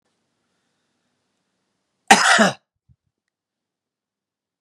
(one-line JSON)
{"cough_length": "4.6 s", "cough_amplitude": 32768, "cough_signal_mean_std_ratio": 0.22, "survey_phase": "beta (2021-08-13 to 2022-03-07)", "age": "65+", "gender": "Male", "wearing_mask": "No", "symptom_cough_any": true, "symptom_onset": "12 days", "smoker_status": "Never smoked", "respiratory_condition_asthma": false, "respiratory_condition_other": false, "recruitment_source": "REACT", "submission_delay": "4 days", "covid_test_result": "Negative", "covid_test_method": "RT-qPCR", "influenza_a_test_result": "Negative", "influenza_b_test_result": "Negative"}